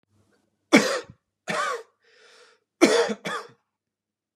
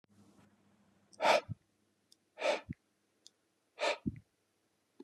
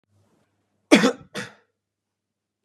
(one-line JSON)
{"three_cough_length": "4.4 s", "three_cough_amplitude": 27958, "three_cough_signal_mean_std_ratio": 0.34, "exhalation_length": "5.0 s", "exhalation_amplitude": 5415, "exhalation_signal_mean_std_ratio": 0.28, "cough_length": "2.6 s", "cough_amplitude": 32664, "cough_signal_mean_std_ratio": 0.22, "survey_phase": "beta (2021-08-13 to 2022-03-07)", "age": "45-64", "gender": "Male", "wearing_mask": "No", "symptom_cough_any": true, "symptom_sore_throat": true, "symptom_fatigue": true, "symptom_headache": true, "symptom_change_to_sense_of_smell_or_taste": true, "symptom_onset": "2 days", "smoker_status": "Never smoked", "respiratory_condition_asthma": false, "respiratory_condition_other": false, "recruitment_source": "Test and Trace", "submission_delay": "1 day", "covid_test_result": "Positive", "covid_test_method": "ePCR"}